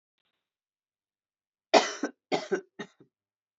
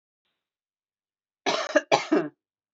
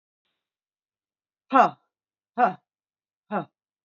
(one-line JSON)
{"three_cough_length": "3.6 s", "three_cough_amplitude": 19990, "three_cough_signal_mean_std_ratio": 0.23, "cough_length": "2.7 s", "cough_amplitude": 21515, "cough_signal_mean_std_ratio": 0.33, "exhalation_length": "3.8 s", "exhalation_amplitude": 21973, "exhalation_signal_mean_std_ratio": 0.23, "survey_phase": "beta (2021-08-13 to 2022-03-07)", "age": "45-64", "gender": "Female", "wearing_mask": "No", "symptom_cough_any": true, "symptom_runny_or_blocked_nose": true, "symptom_shortness_of_breath": true, "symptom_loss_of_taste": true, "symptom_onset": "5 days", "smoker_status": "Never smoked", "respiratory_condition_asthma": false, "respiratory_condition_other": false, "recruitment_source": "Test and Trace", "submission_delay": "1 day", "covid_test_result": "Positive", "covid_test_method": "ePCR"}